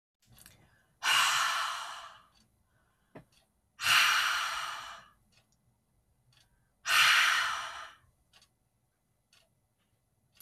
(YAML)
exhalation_length: 10.4 s
exhalation_amplitude: 8310
exhalation_signal_mean_std_ratio: 0.41
survey_phase: beta (2021-08-13 to 2022-03-07)
age: 65+
gender: Female
wearing_mask: 'No'
symptom_cough_any: true
smoker_status: Never smoked
respiratory_condition_asthma: false
respiratory_condition_other: false
recruitment_source: REACT
submission_delay: 6 days
covid_test_result: Negative
covid_test_method: RT-qPCR
influenza_a_test_result: Unknown/Void
influenza_b_test_result: Unknown/Void